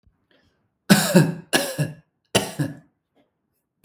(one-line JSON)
{"three_cough_length": "3.8 s", "three_cough_amplitude": 32766, "three_cough_signal_mean_std_ratio": 0.36, "survey_phase": "beta (2021-08-13 to 2022-03-07)", "age": "18-44", "gender": "Male", "wearing_mask": "No", "symptom_none": true, "smoker_status": "Never smoked", "respiratory_condition_asthma": false, "respiratory_condition_other": false, "recruitment_source": "REACT", "submission_delay": "1 day", "covid_test_result": "Negative", "covid_test_method": "RT-qPCR", "influenza_a_test_result": "Unknown/Void", "influenza_b_test_result": "Unknown/Void"}